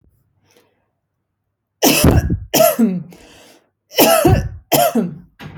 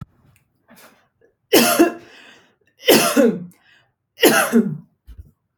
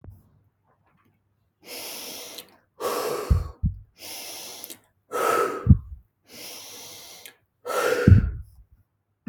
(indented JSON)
{
  "cough_length": "5.6 s",
  "cough_amplitude": 32768,
  "cough_signal_mean_std_ratio": 0.49,
  "three_cough_length": "5.6 s",
  "three_cough_amplitude": 32767,
  "three_cough_signal_mean_std_ratio": 0.41,
  "exhalation_length": "9.3 s",
  "exhalation_amplitude": 25950,
  "exhalation_signal_mean_std_ratio": 0.36,
  "survey_phase": "beta (2021-08-13 to 2022-03-07)",
  "age": "18-44",
  "gender": "Female",
  "wearing_mask": "No",
  "symptom_none": true,
  "smoker_status": "Never smoked",
  "respiratory_condition_asthma": false,
  "respiratory_condition_other": false,
  "recruitment_source": "REACT",
  "submission_delay": "1 day",
  "covid_test_result": "Negative",
  "covid_test_method": "RT-qPCR"
}